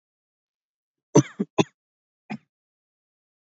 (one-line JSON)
{"three_cough_length": "3.5 s", "three_cough_amplitude": 25851, "three_cough_signal_mean_std_ratio": 0.16, "survey_phase": "beta (2021-08-13 to 2022-03-07)", "age": "18-44", "gender": "Male", "wearing_mask": "No", "symptom_none": true, "smoker_status": "Never smoked", "respiratory_condition_asthma": false, "respiratory_condition_other": false, "recruitment_source": "REACT", "submission_delay": "1 day", "covid_test_result": "Negative", "covid_test_method": "RT-qPCR", "covid_ct_value": 39.6, "covid_ct_gene": "N gene", "influenza_a_test_result": "Negative", "influenza_b_test_result": "Negative"}